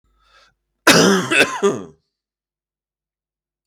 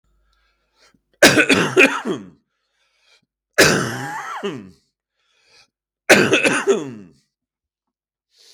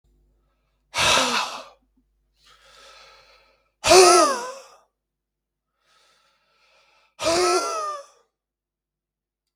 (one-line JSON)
{"cough_length": "3.7 s", "cough_amplitude": 32768, "cough_signal_mean_std_ratio": 0.36, "three_cough_length": "8.5 s", "three_cough_amplitude": 32768, "three_cough_signal_mean_std_ratio": 0.37, "exhalation_length": "9.6 s", "exhalation_amplitude": 32768, "exhalation_signal_mean_std_ratio": 0.33, "survey_phase": "beta (2021-08-13 to 2022-03-07)", "age": "45-64", "gender": "Male", "wearing_mask": "No", "symptom_cough_any": true, "symptom_runny_or_blocked_nose": true, "symptom_fatigue": true, "symptom_fever_high_temperature": true, "symptom_headache": true, "symptom_loss_of_taste": true, "symptom_other": true, "symptom_onset": "3 days", "smoker_status": "Ex-smoker", "respiratory_condition_asthma": false, "respiratory_condition_other": false, "recruitment_source": "Test and Trace", "submission_delay": "2 days", "covid_test_result": "Positive", "covid_test_method": "RT-qPCR", "covid_ct_value": 18.0, "covid_ct_gene": "ORF1ab gene", "covid_ct_mean": 18.5, "covid_viral_load": "860000 copies/ml", "covid_viral_load_category": "Low viral load (10K-1M copies/ml)"}